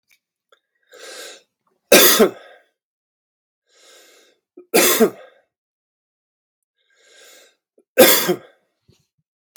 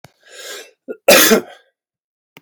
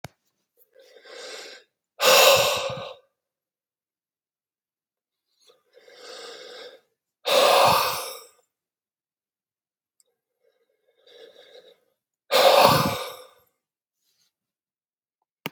{"three_cough_length": "9.6 s", "three_cough_amplitude": 32768, "three_cough_signal_mean_std_ratio": 0.27, "cough_length": "2.4 s", "cough_amplitude": 32768, "cough_signal_mean_std_ratio": 0.34, "exhalation_length": "15.5 s", "exhalation_amplitude": 32537, "exhalation_signal_mean_std_ratio": 0.31, "survey_phase": "beta (2021-08-13 to 2022-03-07)", "age": "45-64", "gender": "Male", "wearing_mask": "No", "symptom_cough_any": true, "symptom_new_continuous_cough": true, "symptom_runny_or_blocked_nose": true, "symptom_abdominal_pain": true, "symptom_fatigue": true, "symptom_fever_high_temperature": true, "symptom_headache": true, "smoker_status": "Ex-smoker", "respiratory_condition_asthma": false, "respiratory_condition_other": false, "recruitment_source": "Test and Trace", "submission_delay": "2 days", "covid_test_result": "Positive", "covid_test_method": "LFT"}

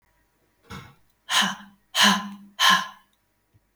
{"exhalation_length": "3.8 s", "exhalation_amplitude": 19408, "exhalation_signal_mean_std_ratio": 0.38, "survey_phase": "alpha (2021-03-01 to 2021-08-12)", "age": "45-64", "gender": "Female", "wearing_mask": "No", "symptom_none": true, "smoker_status": "Never smoked", "respiratory_condition_asthma": false, "respiratory_condition_other": false, "recruitment_source": "REACT", "submission_delay": "1 day", "covid_test_result": "Negative", "covid_test_method": "RT-qPCR"}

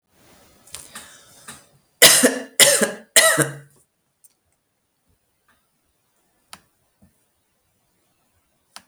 {"three_cough_length": "8.9 s", "three_cough_amplitude": 32768, "three_cough_signal_mean_std_ratio": 0.25, "survey_phase": "beta (2021-08-13 to 2022-03-07)", "age": "45-64", "gender": "Female", "wearing_mask": "No", "symptom_sore_throat": true, "symptom_onset": "13 days", "smoker_status": "Never smoked", "respiratory_condition_asthma": false, "respiratory_condition_other": false, "recruitment_source": "REACT", "submission_delay": "6 days", "covid_test_result": "Negative", "covid_test_method": "RT-qPCR", "influenza_a_test_result": "Negative", "influenza_b_test_result": "Negative"}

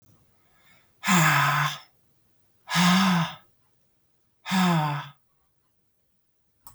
{"exhalation_length": "6.7 s", "exhalation_amplitude": 13045, "exhalation_signal_mean_std_ratio": 0.46, "survey_phase": "beta (2021-08-13 to 2022-03-07)", "age": "18-44", "gender": "Female", "wearing_mask": "No", "symptom_none": true, "smoker_status": "Never smoked", "respiratory_condition_asthma": false, "respiratory_condition_other": false, "recruitment_source": "REACT", "submission_delay": "2 days", "covid_test_result": "Negative", "covid_test_method": "RT-qPCR", "influenza_a_test_result": "Negative", "influenza_b_test_result": "Negative"}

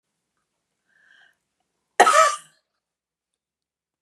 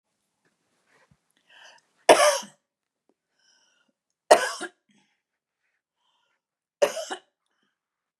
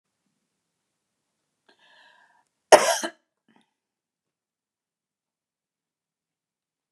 {"exhalation_length": "4.0 s", "exhalation_amplitude": 32297, "exhalation_signal_mean_std_ratio": 0.23, "three_cough_length": "8.2 s", "three_cough_amplitude": 30647, "three_cough_signal_mean_std_ratio": 0.2, "cough_length": "6.9 s", "cough_amplitude": 32741, "cough_signal_mean_std_ratio": 0.12, "survey_phase": "beta (2021-08-13 to 2022-03-07)", "age": "65+", "gender": "Female", "wearing_mask": "No", "symptom_none": true, "smoker_status": "Ex-smoker", "respiratory_condition_asthma": false, "respiratory_condition_other": false, "recruitment_source": "REACT", "submission_delay": "1 day", "covid_test_result": "Negative", "covid_test_method": "RT-qPCR", "influenza_a_test_result": "Negative", "influenza_b_test_result": "Negative"}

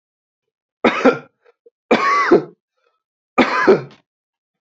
{"three_cough_length": "4.6 s", "three_cough_amplitude": 27929, "three_cough_signal_mean_std_ratio": 0.4, "survey_phase": "beta (2021-08-13 to 2022-03-07)", "age": "18-44", "gender": "Male", "wearing_mask": "No", "symptom_runny_or_blocked_nose": true, "symptom_fatigue": true, "symptom_headache": true, "symptom_onset": "3 days", "smoker_status": "Never smoked", "respiratory_condition_asthma": false, "respiratory_condition_other": false, "recruitment_source": "Test and Trace", "submission_delay": "2 days", "covid_test_result": "Positive", "covid_test_method": "ePCR"}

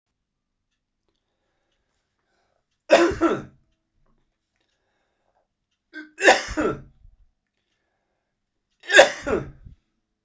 {"three_cough_length": "10.2 s", "three_cough_amplitude": 32768, "three_cough_signal_mean_std_ratio": 0.24, "survey_phase": "beta (2021-08-13 to 2022-03-07)", "age": "65+", "gender": "Male", "wearing_mask": "No", "symptom_cough_any": true, "symptom_runny_or_blocked_nose": true, "symptom_fatigue": true, "symptom_other": true, "symptom_onset": "3 days", "smoker_status": "Never smoked", "respiratory_condition_asthma": false, "respiratory_condition_other": false, "recruitment_source": "Test and Trace", "submission_delay": "2 days", "covid_test_result": "Positive", "covid_test_method": "LAMP"}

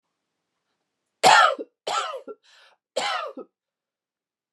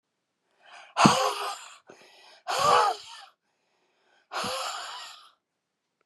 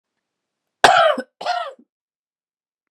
{"three_cough_length": "4.5 s", "three_cough_amplitude": 25008, "three_cough_signal_mean_std_ratio": 0.31, "exhalation_length": "6.1 s", "exhalation_amplitude": 26304, "exhalation_signal_mean_std_ratio": 0.38, "cough_length": "2.9 s", "cough_amplitude": 32768, "cough_signal_mean_std_ratio": 0.32, "survey_phase": "beta (2021-08-13 to 2022-03-07)", "age": "45-64", "gender": "Female", "wearing_mask": "No", "symptom_runny_or_blocked_nose": true, "symptom_fatigue": true, "symptom_change_to_sense_of_smell_or_taste": true, "symptom_loss_of_taste": true, "symptom_onset": "8 days", "smoker_status": "Never smoked", "respiratory_condition_asthma": false, "respiratory_condition_other": false, "recruitment_source": "REACT", "submission_delay": "1 day", "covid_test_result": "Negative", "covid_test_method": "RT-qPCR"}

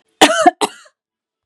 {"cough_length": "1.5 s", "cough_amplitude": 32768, "cough_signal_mean_std_ratio": 0.36, "survey_phase": "beta (2021-08-13 to 2022-03-07)", "age": "45-64", "gender": "Female", "wearing_mask": "No", "symptom_none": true, "smoker_status": "Never smoked", "respiratory_condition_asthma": true, "respiratory_condition_other": false, "recruitment_source": "REACT", "submission_delay": "1 day", "covid_test_result": "Negative", "covid_test_method": "RT-qPCR", "influenza_a_test_result": "Negative", "influenza_b_test_result": "Negative"}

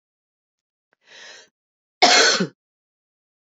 {"cough_length": "3.4 s", "cough_amplitude": 30040, "cough_signal_mean_std_ratio": 0.29, "survey_phase": "beta (2021-08-13 to 2022-03-07)", "age": "45-64", "gender": "Female", "wearing_mask": "No", "symptom_cough_any": true, "symptom_runny_or_blocked_nose": true, "symptom_fatigue": true, "symptom_headache": true, "symptom_onset": "5 days", "smoker_status": "Never smoked", "respiratory_condition_asthma": false, "respiratory_condition_other": false, "recruitment_source": "Test and Trace", "submission_delay": "3 days", "covid_test_result": "Positive", "covid_test_method": "RT-qPCR"}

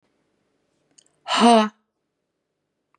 {"exhalation_length": "3.0 s", "exhalation_amplitude": 27194, "exhalation_signal_mean_std_ratio": 0.28, "survey_phase": "beta (2021-08-13 to 2022-03-07)", "age": "65+", "gender": "Female", "wearing_mask": "No", "symptom_none": true, "smoker_status": "Ex-smoker", "respiratory_condition_asthma": false, "respiratory_condition_other": false, "recruitment_source": "REACT", "submission_delay": "6 days", "covid_test_result": "Negative", "covid_test_method": "RT-qPCR", "influenza_a_test_result": "Unknown/Void", "influenza_b_test_result": "Unknown/Void"}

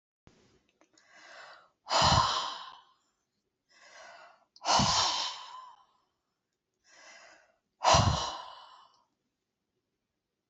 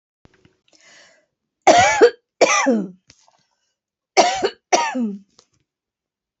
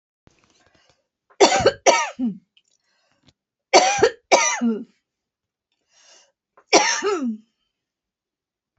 {"exhalation_length": "10.5 s", "exhalation_amplitude": 10115, "exhalation_signal_mean_std_ratio": 0.35, "cough_length": "6.4 s", "cough_amplitude": 29886, "cough_signal_mean_std_ratio": 0.38, "three_cough_length": "8.8 s", "three_cough_amplitude": 29256, "three_cough_signal_mean_std_ratio": 0.36, "survey_phase": "beta (2021-08-13 to 2022-03-07)", "age": "65+", "gender": "Female", "wearing_mask": "No", "symptom_none": true, "smoker_status": "Ex-smoker", "respiratory_condition_asthma": false, "respiratory_condition_other": false, "recruitment_source": "REACT", "submission_delay": "2 days", "covid_test_result": "Negative", "covid_test_method": "RT-qPCR"}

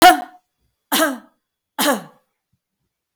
{"three_cough_length": "3.2 s", "three_cough_amplitude": 32768, "three_cough_signal_mean_std_ratio": 0.32, "survey_phase": "beta (2021-08-13 to 2022-03-07)", "age": "45-64", "gender": "Female", "wearing_mask": "No", "symptom_none": true, "smoker_status": "Never smoked", "respiratory_condition_asthma": false, "respiratory_condition_other": false, "recruitment_source": "REACT", "submission_delay": "1 day", "covid_test_result": "Negative", "covid_test_method": "RT-qPCR", "influenza_a_test_result": "Unknown/Void", "influenza_b_test_result": "Unknown/Void"}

